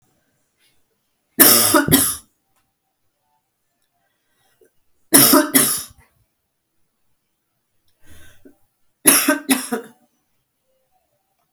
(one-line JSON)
{"three_cough_length": "11.5 s", "three_cough_amplitude": 32768, "three_cough_signal_mean_std_ratio": 0.31, "survey_phase": "beta (2021-08-13 to 2022-03-07)", "age": "65+", "gender": "Female", "wearing_mask": "Yes", "symptom_cough_any": true, "symptom_runny_or_blocked_nose": true, "symptom_diarrhoea": true, "symptom_headache": true, "symptom_other": true, "symptom_onset": "3 days", "smoker_status": "Never smoked", "respiratory_condition_asthma": false, "respiratory_condition_other": false, "recruitment_source": "Test and Trace", "submission_delay": "1 day", "covid_test_result": "Positive", "covid_test_method": "RT-qPCR", "covid_ct_value": 23.8, "covid_ct_gene": "ORF1ab gene"}